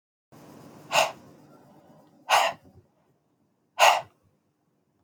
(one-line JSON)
{"exhalation_length": "5.0 s", "exhalation_amplitude": 22444, "exhalation_signal_mean_std_ratio": 0.29, "survey_phase": "beta (2021-08-13 to 2022-03-07)", "age": "45-64", "gender": "Female", "wearing_mask": "No", "symptom_runny_or_blocked_nose": true, "symptom_fatigue": true, "symptom_headache": true, "smoker_status": "Ex-smoker", "respiratory_condition_asthma": false, "respiratory_condition_other": false, "recruitment_source": "Test and Trace", "submission_delay": "2 days", "covid_test_result": "Positive", "covid_test_method": "RT-qPCR", "covid_ct_value": 20.6, "covid_ct_gene": "N gene"}